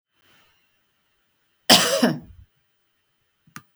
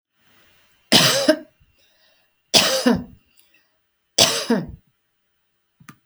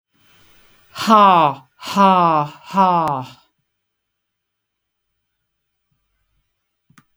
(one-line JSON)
{"cough_length": "3.8 s", "cough_amplitude": 32768, "cough_signal_mean_std_ratio": 0.26, "three_cough_length": "6.1 s", "three_cough_amplitude": 32768, "three_cough_signal_mean_std_ratio": 0.36, "exhalation_length": "7.2 s", "exhalation_amplitude": 32766, "exhalation_signal_mean_std_ratio": 0.36, "survey_phase": "beta (2021-08-13 to 2022-03-07)", "age": "45-64", "gender": "Female", "wearing_mask": "No", "symptom_none": true, "symptom_onset": "2 days", "smoker_status": "Never smoked", "respiratory_condition_asthma": false, "respiratory_condition_other": false, "recruitment_source": "REACT", "submission_delay": "1 day", "covid_test_result": "Negative", "covid_test_method": "RT-qPCR", "influenza_a_test_result": "Negative", "influenza_b_test_result": "Negative"}